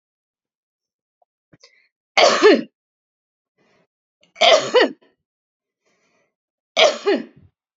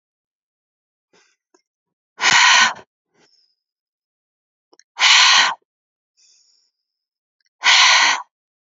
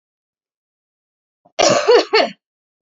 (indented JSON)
{
  "three_cough_length": "7.8 s",
  "three_cough_amplitude": 32767,
  "three_cough_signal_mean_std_ratio": 0.3,
  "exhalation_length": "8.8 s",
  "exhalation_amplitude": 32089,
  "exhalation_signal_mean_std_ratio": 0.35,
  "cough_length": "2.8 s",
  "cough_amplitude": 27976,
  "cough_signal_mean_std_ratio": 0.37,
  "survey_phase": "alpha (2021-03-01 to 2021-08-12)",
  "age": "18-44",
  "gender": "Female",
  "wearing_mask": "No",
  "symptom_none": true,
  "smoker_status": "Current smoker (e-cigarettes or vapes only)",
  "respiratory_condition_asthma": false,
  "respiratory_condition_other": false,
  "recruitment_source": "REACT",
  "submission_delay": "2 days",
  "covid_test_result": "Negative",
  "covid_test_method": "RT-qPCR"
}